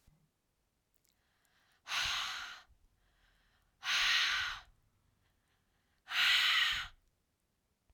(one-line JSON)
{"exhalation_length": "7.9 s", "exhalation_amplitude": 3926, "exhalation_signal_mean_std_ratio": 0.42, "survey_phase": "alpha (2021-03-01 to 2021-08-12)", "age": "18-44", "gender": "Female", "wearing_mask": "No", "symptom_none": true, "smoker_status": "Never smoked", "respiratory_condition_asthma": false, "respiratory_condition_other": false, "recruitment_source": "REACT", "submission_delay": "2 days", "covid_test_result": "Negative", "covid_test_method": "RT-qPCR"}